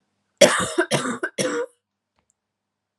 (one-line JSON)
{"three_cough_length": "3.0 s", "three_cough_amplitude": 32297, "three_cough_signal_mean_std_ratio": 0.39, "survey_phase": "alpha (2021-03-01 to 2021-08-12)", "age": "18-44", "gender": "Female", "wearing_mask": "No", "symptom_cough_any": true, "symptom_new_continuous_cough": true, "symptom_shortness_of_breath": true, "symptom_fatigue": true, "symptom_fever_high_temperature": true, "symptom_headache": true, "symptom_change_to_sense_of_smell_or_taste": true, "symptom_onset": "3 days", "smoker_status": "Never smoked", "respiratory_condition_asthma": true, "respiratory_condition_other": false, "recruitment_source": "Test and Trace", "submission_delay": "2 days", "covid_test_result": "Positive", "covid_test_method": "RT-qPCR", "covid_ct_value": 12.6, "covid_ct_gene": "N gene", "covid_ct_mean": 13.6, "covid_viral_load": "34000000 copies/ml", "covid_viral_load_category": "High viral load (>1M copies/ml)"}